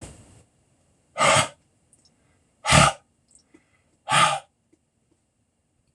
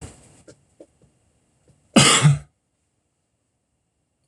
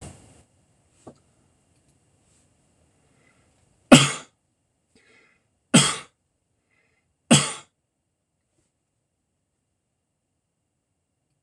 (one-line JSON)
{"exhalation_length": "5.9 s", "exhalation_amplitude": 26028, "exhalation_signal_mean_std_ratio": 0.3, "cough_length": "4.3 s", "cough_amplitude": 26027, "cough_signal_mean_std_ratio": 0.26, "three_cough_length": "11.4 s", "three_cough_amplitude": 26028, "three_cough_signal_mean_std_ratio": 0.16, "survey_phase": "beta (2021-08-13 to 2022-03-07)", "age": "65+", "gender": "Male", "wearing_mask": "No", "symptom_none": true, "smoker_status": "Never smoked", "respiratory_condition_asthma": false, "respiratory_condition_other": false, "recruitment_source": "REACT", "submission_delay": "3 days", "covid_test_result": "Negative", "covid_test_method": "RT-qPCR"}